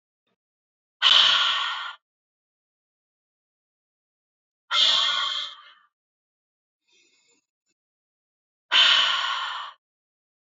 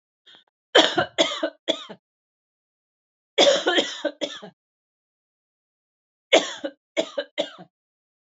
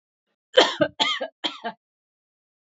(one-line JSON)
{"exhalation_length": "10.4 s", "exhalation_amplitude": 20056, "exhalation_signal_mean_std_ratio": 0.37, "three_cough_length": "8.4 s", "three_cough_amplitude": 27711, "three_cough_signal_mean_std_ratio": 0.33, "cough_length": "2.7 s", "cough_amplitude": 27346, "cough_signal_mean_std_ratio": 0.32, "survey_phase": "beta (2021-08-13 to 2022-03-07)", "age": "45-64", "gender": "Female", "wearing_mask": "No", "symptom_none": true, "smoker_status": "Never smoked", "respiratory_condition_asthma": false, "respiratory_condition_other": false, "recruitment_source": "REACT", "submission_delay": "1 day", "covid_test_result": "Negative", "covid_test_method": "RT-qPCR", "influenza_a_test_result": "Negative", "influenza_b_test_result": "Negative"}